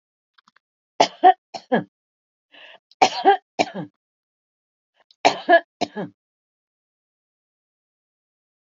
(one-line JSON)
{"three_cough_length": "8.8 s", "three_cough_amplitude": 28591, "three_cough_signal_mean_std_ratio": 0.24, "survey_phase": "alpha (2021-03-01 to 2021-08-12)", "age": "45-64", "gender": "Female", "wearing_mask": "No", "symptom_none": true, "smoker_status": "Never smoked", "respiratory_condition_asthma": false, "respiratory_condition_other": false, "recruitment_source": "REACT", "submission_delay": "2 days", "covid_test_result": "Negative", "covid_test_method": "RT-qPCR"}